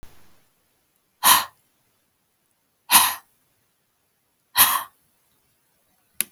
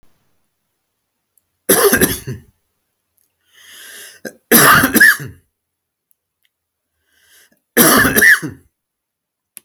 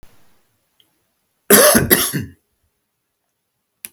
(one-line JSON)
{"exhalation_length": "6.3 s", "exhalation_amplitude": 32768, "exhalation_signal_mean_std_ratio": 0.25, "three_cough_length": "9.6 s", "three_cough_amplitude": 32768, "three_cough_signal_mean_std_ratio": 0.36, "cough_length": "3.9 s", "cough_amplitude": 32768, "cough_signal_mean_std_ratio": 0.31, "survey_phase": "alpha (2021-03-01 to 2021-08-12)", "age": "45-64", "gender": "Male", "wearing_mask": "No", "symptom_none": true, "smoker_status": "Never smoked", "respiratory_condition_asthma": false, "respiratory_condition_other": false, "recruitment_source": "REACT", "submission_delay": "3 days", "covid_test_result": "Negative", "covid_test_method": "RT-qPCR"}